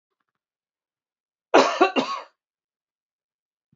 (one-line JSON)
{"cough_length": "3.8 s", "cough_amplitude": 31324, "cough_signal_mean_std_ratio": 0.26, "survey_phase": "beta (2021-08-13 to 2022-03-07)", "age": "45-64", "gender": "Male", "wearing_mask": "No", "symptom_none": true, "smoker_status": "Never smoked", "respiratory_condition_asthma": false, "respiratory_condition_other": false, "recruitment_source": "REACT", "submission_delay": "1 day", "covid_test_result": "Negative", "covid_test_method": "RT-qPCR"}